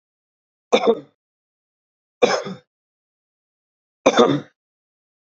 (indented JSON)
{
  "three_cough_length": "5.2 s",
  "three_cough_amplitude": 32768,
  "three_cough_signal_mean_std_ratio": 0.28,
  "survey_phase": "beta (2021-08-13 to 2022-03-07)",
  "age": "18-44",
  "gender": "Male",
  "wearing_mask": "No",
  "symptom_headache": true,
  "smoker_status": "Current smoker (11 or more cigarettes per day)",
  "respiratory_condition_asthma": false,
  "respiratory_condition_other": false,
  "recruitment_source": "REACT",
  "submission_delay": "1 day",
  "covid_test_result": "Negative",
  "covid_test_method": "RT-qPCR",
  "influenza_a_test_result": "Negative",
  "influenza_b_test_result": "Negative"
}